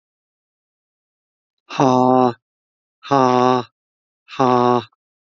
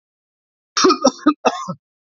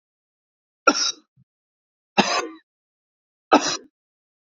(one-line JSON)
{"exhalation_length": "5.2 s", "exhalation_amplitude": 27785, "exhalation_signal_mean_std_ratio": 0.37, "cough_length": "2.0 s", "cough_amplitude": 29967, "cough_signal_mean_std_ratio": 0.4, "three_cough_length": "4.4 s", "three_cough_amplitude": 28224, "three_cough_signal_mean_std_ratio": 0.28, "survey_phase": "beta (2021-08-13 to 2022-03-07)", "age": "45-64", "gender": "Male", "wearing_mask": "No", "symptom_cough_any": true, "symptom_onset": "12 days", "smoker_status": "Never smoked", "respiratory_condition_asthma": false, "respiratory_condition_other": false, "recruitment_source": "REACT", "submission_delay": "1 day", "covid_test_result": "Negative", "covid_test_method": "RT-qPCR"}